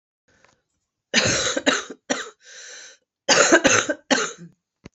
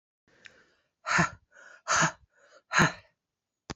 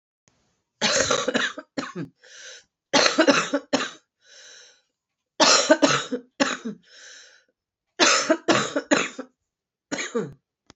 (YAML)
cough_length: 4.9 s
cough_amplitude: 29631
cough_signal_mean_std_ratio: 0.44
exhalation_length: 3.8 s
exhalation_amplitude: 12540
exhalation_signal_mean_std_ratio: 0.34
three_cough_length: 10.8 s
three_cough_amplitude: 30145
three_cough_signal_mean_std_ratio: 0.44
survey_phase: beta (2021-08-13 to 2022-03-07)
age: 45-64
gender: Female
wearing_mask: 'No'
symptom_cough_any: true
symptom_runny_or_blocked_nose: true
symptom_shortness_of_breath: true
symptom_diarrhoea: true
symptom_fatigue: true
symptom_headache: true
symptom_other: true
symptom_onset: 4 days
smoker_status: Current smoker (e-cigarettes or vapes only)
respiratory_condition_asthma: false
respiratory_condition_other: false
recruitment_source: Test and Trace
submission_delay: 3 days
covid_test_result: Positive
covid_test_method: RT-qPCR
covid_ct_value: 12.5
covid_ct_gene: ORF1ab gene
covid_ct_mean: 13.0
covid_viral_load: 54000000 copies/ml
covid_viral_load_category: High viral load (>1M copies/ml)